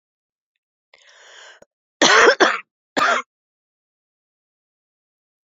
{"cough_length": "5.5 s", "cough_amplitude": 30147, "cough_signal_mean_std_ratio": 0.29, "survey_phase": "beta (2021-08-13 to 2022-03-07)", "age": "65+", "gender": "Female", "wearing_mask": "No", "symptom_cough_any": true, "symptom_runny_or_blocked_nose": true, "symptom_sore_throat": true, "symptom_headache": true, "smoker_status": "Ex-smoker", "respiratory_condition_asthma": false, "respiratory_condition_other": false, "recruitment_source": "Test and Trace", "submission_delay": "1 day", "covid_test_result": "Positive", "covid_test_method": "ePCR"}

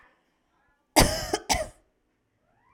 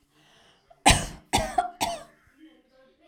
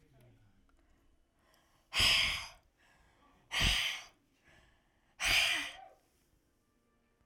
{"cough_length": "2.7 s", "cough_amplitude": 32200, "cough_signal_mean_std_ratio": 0.29, "three_cough_length": "3.1 s", "three_cough_amplitude": 23195, "three_cough_signal_mean_std_ratio": 0.33, "exhalation_length": "7.3 s", "exhalation_amplitude": 5150, "exhalation_signal_mean_std_ratio": 0.37, "survey_phase": "alpha (2021-03-01 to 2021-08-12)", "age": "18-44", "gender": "Female", "wearing_mask": "No", "symptom_none": true, "smoker_status": "Never smoked", "respiratory_condition_asthma": true, "respiratory_condition_other": false, "recruitment_source": "REACT", "submission_delay": "1 day", "covid_test_result": "Negative", "covid_test_method": "RT-qPCR"}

